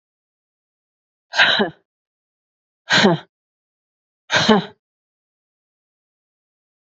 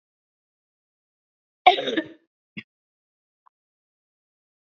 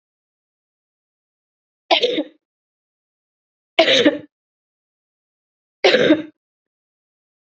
exhalation_length: 6.9 s
exhalation_amplitude: 28893
exhalation_signal_mean_std_ratio: 0.29
cough_length: 4.7 s
cough_amplitude: 27320
cough_signal_mean_std_ratio: 0.16
three_cough_length: 7.5 s
three_cough_amplitude: 30619
three_cough_signal_mean_std_ratio: 0.28
survey_phase: beta (2021-08-13 to 2022-03-07)
age: 45-64
gender: Female
wearing_mask: 'No'
symptom_cough_any: true
symptom_runny_or_blocked_nose: true
symptom_sore_throat: true
symptom_fever_high_temperature: true
symptom_onset: 3 days
smoker_status: Ex-smoker
respiratory_condition_asthma: false
respiratory_condition_other: false
recruitment_source: Test and Trace
submission_delay: 1 day
covid_test_result: Positive
covid_test_method: ePCR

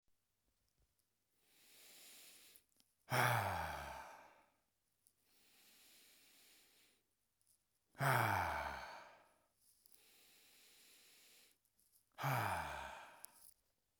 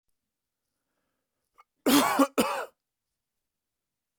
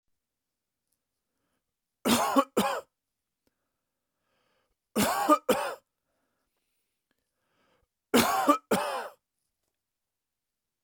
exhalation_length: 14.0 s
exhalation_amplitude: 3004
exhalation_signal_mean_std_ratio: 0.36
cough_length: 4.2 s
cough_amplitude: 14588
cough_signal_mean_std_ratio: 0.3
three_cough_length: 10.8 s
three_cough_amplitude: 14012
three_cough_signal_mean_std_ratio: 0.32
survey_phase: beta (2021-08-13 to 2022-03-07)
age: 18-44
gender: Male
wearing_mask: 'No'
symptom_none: true
smoker_status: Ex-smoker
respiratory_condition_asthma: false
respiratory_condition_other: false
recruitment_source: REACT
submission_delay: 2 days
covid_test_result: Negative
covid_test_method: RT-qPCR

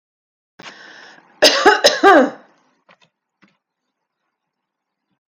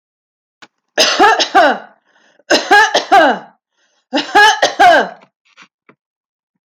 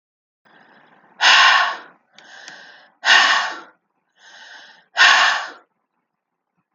cough_length: 5.3 s
cough_amplitude: 30520
cough_signal_mean_std_ratio: 0.3
three_cough_length: 6.7 s
three_cough_amplitude: 32767
three_cough_signal_mean_std_ratio: 0.48
exhalation_length: 6.7 s
exhalation_amplitude: 32767
exhalation_signal_mean_std_ratio: 0.39
survey_phase: alpha (2021-03-01 to 2021-08-12)
age: 45-64
gender: Female
wearing_mask: 'No'
symptom_none: true
symptom_onset: 10 days
smoker_status: Ex-smoker
respiratory_condition_asthma: false
respiratory_condition_other: false
recruitment_source: REACT
submission_delay: 2 days
covid_test_result: Negative
covid_test_method: RT-qPCR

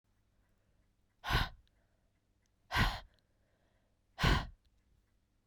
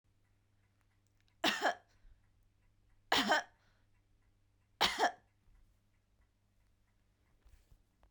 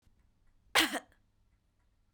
exhalation_length: 5.5 s
exhalation_amplitude: 5456
exhalation_signal_mean_std_ratio: 0.29
three_cough_length: 8.1 s
three_cough_amplitude: 5156
three_cough_signal_mean_std_ratio: 0.27
cough_length: 2.1 s
cough_amplitude: 8588
cough_signal_mean_std_ratio: 0.24
survey_phase: beta (2021-08-13 to 2022-03-07)
age: 45-64
gender: Female
wearing_mask: 'No'
symptom_cough_any: true
symptom_runny_or_blocked_nose: true
symptom_fatigue: true
symptom_onset: 5 days
smoker_status: Never smoked
respiratory_condition_asthma: false
respiratory_condition_other: false
recruitment_source: Test and Trace
submission_delay: 2 days
covid_test_result: Positive
covid_test_method: RT-qPCR
covid_ct_value: 20.9
covid_ct_gene: ORF1ab gene
covid_ct_mean: 21.8
covid_viral_load: 72000 copies/ml
covid_viral_load_category: Low viral load (10K-1M copies/ml)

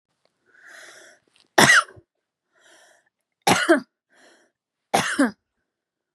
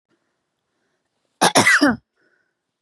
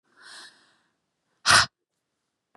three_cough_length: 6.1 s
three_cough_amplitude: 32767
three_cough_signal_mean_std_ratio: 0.29
cough_length: 2.8 s
cough_amplitude: 30757
cough_signal_mean_std_ratio: 0.33
exhalation_length: 2.6 s
exhalation_amplitude: 20288
exhalation_signal_mean_std_ratio: 0.22
survey_phase: beta (2021-08-13 to 2022-03-07)
age: 18-44
gender: Female
wearing_mask: 'No'
symptom_shortness_of_breath: true
symptom_diarrhoea: true
symptom_other: true
smoker_status: Never smoked
respiratory_condition_asthma: false
respiratory_condition_other: false
recruitment_source: REACT
submission_delay: 1 day
covid_test_result: Negative
covid_test_method: RT-qPCR
influenza_a_test_result: Negative
influenza_b_test_result: Negative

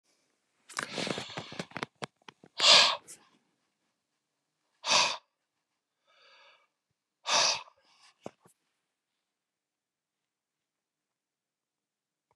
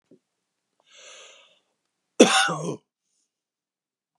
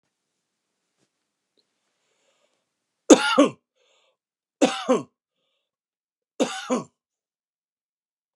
exhalation_length: 12.4 s
exhalation_amplitude: 15258
exhalation_signal_mean_std_ratio: 0.24
cough_length: 4.2 s
cough_amplitude: 32491
cough_signal_mean_std_ratio: 0.23
three_cough_length: 8.4 s
three_cough_amplitude: 32738
three_cough_signal_mean_std_ratio: 0.21
survey_phase: beta (2021-08-13 to 2022-03-07)
age: 65+
gender: Male
wearing_mask: 'No'
symptom_runny_or_blocked_nose: true
symptom_onset: 12 days
smoker_status: Never smoked
respiratory_condition_asthma: false
respiratory_condition_other: false
recruitment_source: REACT
submission_delay: 10 days
covid_test_result: Negative
covid_test_method: RT-qPCR
influenza_a_test_result: Negative
influenza_b_test_result: Negative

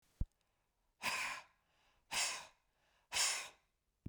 exhalation_length: 4.1 s
exhalation_amplitude: 2843
exhalation_signal_mean_std_ratio: 0.41
survey_phase: beta (2021-08-13 to 2022-03-07)
age: 65+
gender: Male
wearing_mask: 'No'
symptom_cough_any: true
symptom_shortness_of_breath: true
symptom_fatigue: true
symptom_headache: true
symptom_change_to_sense_of_smell_or_taste: true
symptom_loss_of_taste: true
symptom_onset: 5 days
smoker_status: Ex-smoker
respiratory_condition_asthma: false
respiratory_condition_other: false
recruitment_source: Test and Trace
submission_delay: 2 days
covid_test_result: Positive
covid_test_method: ePCR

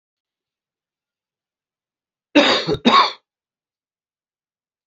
cough_length: 4.9 s
cough_amplitude: 31357
cough_signal_mean_std_ratio: 0.27
survey_phase: beta (2021-08-13 to 2022-03-07)
age: 65+
gender: Male
wearing_mask: 'No'
symptom_cough_any: true
symptom_runny_or_blocked_nose: true
symptom_sore_throat: true
symptom_diarrhoea: true
symptom_fatigue: true
symptom_headache: true
symptom_onset: 3 days
smoker_status: Ex-smoker
respiratory_condition_asthma: true
respiratory_condition_other: false
recruitment_source: REACT
submission_delay: 2 days
covid_test_result: Positive
covid_test_method: RT-qPCR
covid_ct_value: 13.9
covid_ct_gene: E gene
influenza_a_test_result: Negative
influenza_b_test_result: Negative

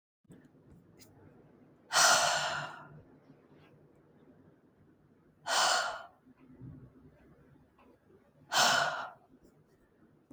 exhalation_length: 10.3 s
exhalation_amplitude: 8917
exhalation_signal_mean_std_ratio: 0.36
survey_phase: beta (2021-08-13 to 2022-03-07)
age: 18-44
gender: Female
wearing_mask: 'No'
symptom_none: true
smoker_status: Never smoked
respiratory_condition_asthma: false
respiratory_condition_other: false
recruitment_source: REACT
submission_delay: 1 day
covid_test_result: Negative
covid_test_method: RT-qPCR
influenza_a_test_result: Negative
influenza_b_test_result: Negative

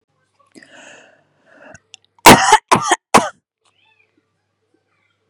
cough_length: 5.3 s
cough_amplitude: 32768
cough_signal_mean_std_ratio: 0.25
survey_phase: beta (2021-08-13 to 2022-03-07)
age: 45-64
gender: Female
wearing_mask: 'No'
symptom_none: true
smoker_status: Ex-smoker
respiratory_condition_asthma: false
respiratory_condition_other: false
recruitment_source: REACT
submission_delay: 1 day
covid_test_result: Negative
covid_test_method: RT-qPCR
influenza_a_test_result: Unknown/Void
influenza_b_test_result: Unknown/Void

